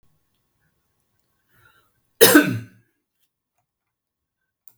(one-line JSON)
{"cough_length": "4.8 s", "cough_amplitude": 32768, "cough_signal_mean_std_ratio": 0.2, "survey_phase": "beta (2021-08-13 to 2022-03-07)", "age": "65+", "gender": "Male", "wearing_mask": "No", "symptom_none": true, "smoker_status": "Never smoked", "respiratory_condition_asthma": false, "respiratory_condition_other": false, "recruitment_source": "REACT", "submission_delay": "1 day", "covid_test_result": "Negative", "covid_test_method": "RT-qPCR"}